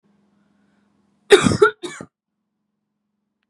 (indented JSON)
{
  "cough_length": "3.5 s",
  "cough_amplitude": 32767,
  "cough_signal_mean_std_ratio": 0.23,
  "survey_phase": "beta (2021-08-13 to 2022-03-07)",
  "age": "18-44",
  "gender": "Female",
  "wearing_mask": "No",
  "symptom_runny_or_blocked_nose": true,
  "symptom_fatigue": true,
  "symptom_change_to_sense_of_smell_or_taste": true,
  "symptom_loss_of_taste": true,
  "symptom_onset": "4 days",
  "smoker_status": "Never smoked",
  "respiratory_condition_asthma": false,
  "respiratory_condition_other": false,
  "recruitment_source": "Test and Trace",
  "submission_delay": "1 day",
  "covid_test_result": "Positive",
  "covid_test_method": "RT-qPCR"
}